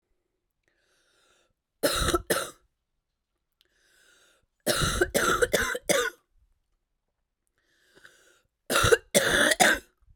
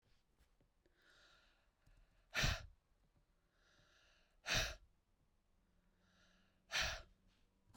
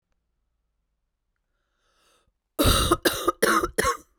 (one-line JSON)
{"three_cough_length": "10.2 s", "three_cough_amplitude": 19369, "three_cough_signal_mean_std_ratio": 0.39, "exhalation_length": "7.8 s", "exhalation_amplitude": 1750, "exhalation_signal_mean_std_ratio": 0.29, "cough_length": "4.2 s", "cough_amplitude": 19393, "cough_signal_mean_std_ratio": 0.39, "survey_phase": "beta (2021-08-13 to 2022-03-07)", "age": "18-44", "gender": "Female", "wearing_mask": "No", "symptom_new_continuous_cough": true, "symptom_shortness_of_breath": true, "symptom_sore_throat": true, "symptom_fatigue": true, "symptom_fever_high_temperature": true, "symptom_headache": true, "symptom_loss_of_taste": true, "smoker_status": "Never smoked", "respiratory_condition_asthma": false, "respiratory_condition_other": false, "recruitment_source": "Test and Trace", "submission_delay": "1 day", "covid_test_result": "Positive", "covid_test_method": "RT-qPCR"}